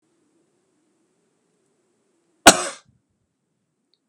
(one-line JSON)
{"cough_length": "4.1 s", "cough_amplitude": 32768, "cough_signal_mean_std_ratio": 0.13, "survey_phase": "beta (2021-08-13 to 2022-03-07)", "age": "65+", "gender": "Male", "wearing_mask": "No", "symptom_none": true, "smoker_status": "Current smoker (1 to 10 cigarettes per day)", "respiratory_condition_asthma": false, "respiratory_condition_other": false, "recruitment_source": "REACT", "submission_delay": "2 days", "covid_test_result": "Negative", "covid_test_method": "RT-qPCR", "influenza_a_test_result": "Negative", "influenza_b_test_result": "Negative"}